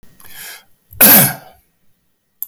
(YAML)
cough_length: 2.5 s
cough_amplitude: 32768
cough_signal_mean_std_ratio: 0.35
survey_phase: beta (2021-08-13 to 2022-03-07)
age: 65+
gender: Male
wearing_mask: 'No'
symptom_none: true
smoker_status: Never smoked
respiratory_condition_asthma: false
respiratory_condition_other: false
recruitment_source: REACT
submission_delay: 4 days
covid_test_result: Negative
covid_test_method: RT-qPCR
influenza_a_test_result: Negative
influenza_b_test_result: Negative